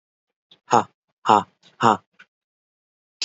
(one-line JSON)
{"exhalation_length": "3.2 s", "exhalation_amplitude": 28309, "exhalation_signal_mean_std_ratio": 0.24, "survey_phase": "beta (2021-08-13 to 2022-03-07)", "age": "18-44", "gender": "Male", "wearing_mask": "No", "symptom_runny_or_blocked_nose": true, "symptom_headache": true, "symptom_other": true, "symptom_onset": "8 days", "smoker_status": "Never smoked", "respiratory_condition_asthma": false, "respiratory_condition_other": false, "recruitment_source": "REACT", "submission_delay": "1 day", "covid_test_result": "Negative", "covid_test_method": "RT-qPCR", "influenza_a_test_result": "Negative", "influenza_b_test_result": "Negative"}